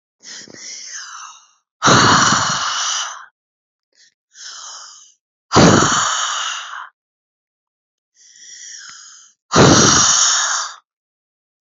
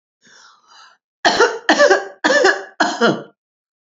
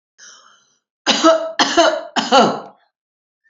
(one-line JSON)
{"exhalation_length": "11.6 s", "exhalation_amplitude": 32768, "exhalation_signal_mean_std_ratio": 0.46, "cough_length": "3.8 s", "cough_amplitude": 28828, "cough_signal_mean_std_ratio": 0.48, "three_cough_length": "3.5 s", "three_cough_amplitude": 30704, "three_cough_signal_mean_std_ratio": 0.46, "survey_phase": "beta (2021-08-13 to 2022-03-07)", "age": "45-64", "gender": "Female", "wearing_mask": "No", "symptom_none": true, "smoker_status": "Never smoked", "respiratory_condition_asthma": false, "respiratory_condition_other": false, "recruitment_source": "REACT", "submission_delay": "1 day", "covid_test_result": "Negative", "covid_test_method": "RT-qPCR", "influenza_a_test_result": "Negative", "influenza_b_test_result": "Negative"}